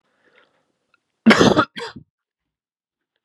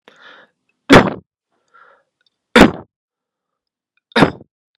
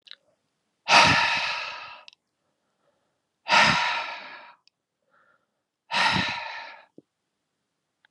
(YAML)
cough_length: 3.2 s
cough_amplitude: 32766
cough_signal_mean_std_ratio: 0.27
three_cough_length: 4.8 s
three_cough_amplitude: 32768
three_cough_signal_mean_std_ratio: 0.25
exhalation_length: 8.1 s
exhalation_amplitude: 24467
exhalation_signal_mean_std_ratio: 0.38
survey_phase: beta (2021-08-13 to 2022-03-07)
age: 18-44
gender: Male
wearing_mask: 'No'
symptom_cough_any: true
symptom_shortness_of_breath: true
symptom_diarrhoea: true
symptom_fatigue: true
symptom_headache: true
symptom_change_to_sense_of_smell_or_taste: true
symptom_loss_of_taste: true
symptom_onset: 3 days
smoker_status: Current smoker (1 to 10 cigarettes per day)
respiratory_condition_asthma: false
respiratory_condition_other: false
recruitment_source: Test and Trace
submission_delay: 2 days
covid_test_result: Positive
covid_test_method: RT-qPCR